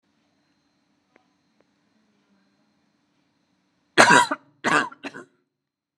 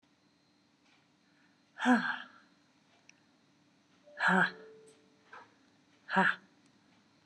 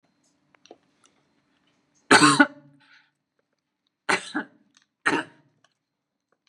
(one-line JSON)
{"cough_length": "6.0 s", "cough_amplitude": 32768, "cough_signal_mean_std_ratio": 0.23, "exhalation_length": "7.3 s", "exhalation_amplitude": 7121, "exhalation_signal_mean_std_ratio": 0.29, "three_cough_length": "6.5 s", "three_cough_amplitude": 30894, "three_cough_signal_mean_std_ratio": 0.23, "survey_phase": "beta (2021-08-13 to 2022-03-07)", "age": "45-64", "gender": "Female", "wearing_mask": "Yes", "symptom_none": true, "symptom_onset": "11 days", "smoker_status": "Never smoked", "respiratory_condition_asthma": false, "respiratory_condition_other": false, "recruitment_source": "REACT", "submission_delay": "12 days", "covid_test_result": "Negative", "covid_test_method": "RT-qPCR"}